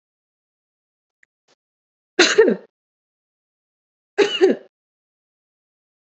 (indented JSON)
{
  "cough_length": "6.1 s",
  "cough_amplitude": 32026,
  "cough_signal_mean_std_ratio": 0.25,
  "survey_phase": "alpha (2021-03-01 to 2021-08-12)",
  "age": "18-44",
  "gender": "Female",
  "wearing_mask": "No",
  "symptom_none": true,
  "symptom_onset": "7 days",
  "smoker_status": "Never smoked",
  "respiratory_condition_asthma": false,
  "respiratory_condition_other": false,
  "recruitment_source": "REACT",
  "submission_delay": "1 day",
  "covid_test_result": "Negative",
  "covid_test_method": "RT-qPCR"
}